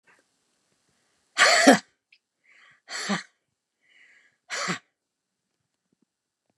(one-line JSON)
{"exhalation_length": "6.6 s", "exhalation_amplitude": 29106, "exhalation_signal_mean_std_ratio": 0.24, "survey_phase": "beta (2021-08-13 to 2022-03-07)", "age": "65+", "gender": "Female", "wearing_mask": "No", "symptom_cough_any": true, "smoker_status": "Ex-smoker", "respiratory_condition_asthma": false, "respiratory_condition_other": true, "recruitment_source": "REACT", "submission_delay": "2 days", "covid_test_result": "Negative", "covid_test_method": "RT-qPCR", "influenza_a_test_result": "Negative", "influenza_b_test_result": "Negative"}